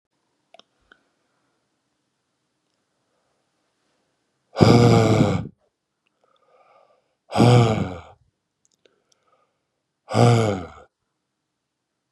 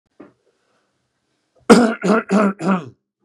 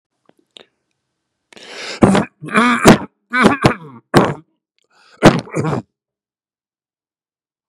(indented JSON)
{
  "exhalation_length": "12.1 s",
  "exhalation_amplitude": 32768,
  "exhalation_signal_mean_std_ratio": 0.3,
  "cough_length": "3.2 s",
  "cough_amplitude": 32768,
  "cough_signal_mean_std_ratio": 0.39,
  "three_cough_length": "7.7 s",
  "three_cough_amplitude": 32768,
  "three_cough_signal_mean_std_ratio": 0.35,
  "survey_phase": "beta (2021-08-13 to 2022-03-07)",
  "age": "45-64",
  "gender": "Male",
  "wearing_mask": "No",
  "symptom_none": true,
  "smoker_status": "Ex-smoker",
  "respiratory_condition_asthma": false,
  "respiratory_condition_other": false,
  "recruitment_source": "REACT",
  "submission_delay": "3 days",
  "covid_test_result": "Negative",
  "covid_test_method": "RT-qPCR"
}